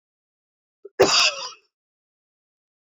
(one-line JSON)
{"cough_length": "2.9 s", "cough_amplitude": 25313, "cough_signal_mean_std_ratio": 0.28, "survey_phase": "beta (2021-08-13 to 2022-03-07)", "age": "45-64", "gender": "Female", "wearing_mask": "No", "symptom_cough_any": true, "symptom_runny_or_blocked_nose": true, "symptom_shortness_of_breath": true, "symptom_sore_throat": true, "symptom_diarrhoea": true, "symptom_fatigue": true, "symptom_fever_high_temperature": true, "symptom_headache": true, "smoker_status": "Never smoked", "respiratory_condition_asthma": true, "respiratory_condition_other": false, "recruitment_source": "Test and Trace", "submission_delay": "2 days", "covid_test_result": "Positive", "covid_test_method": "LFT"}